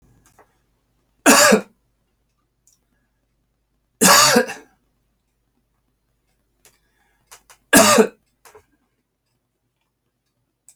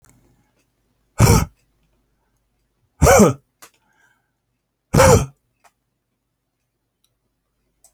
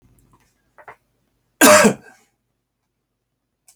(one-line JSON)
{"three_cough_length": "10.8 s", "three_cough_amplitude": 32768, "three_cough_signal_mean_std_ratio": 0.26, "exhalation_length": "7.9 s", "exhalation_amplitude": 30008, "exhalation_signal_mean_std_ratio": 0.27, "cough_length": "3.8 s", "cough_amplitude": 32768, "cough_signal_mean_std_ratio": 0.24, "survey_phase": "alpha (2021-03-01 to 2021-08-12)", "age": "45-64", "gender": "Male", "wearing_mask": "No", "symptom_none": true, "smoker_status": "Never smoked", "respiratory_condition_asthma": false, "respiratory_condition_other": false, "recruitment_source": "REACT", "submission_delay": "1 day", "covid_test_result": "Negative", "covid_test_method": "RT-qPCR"}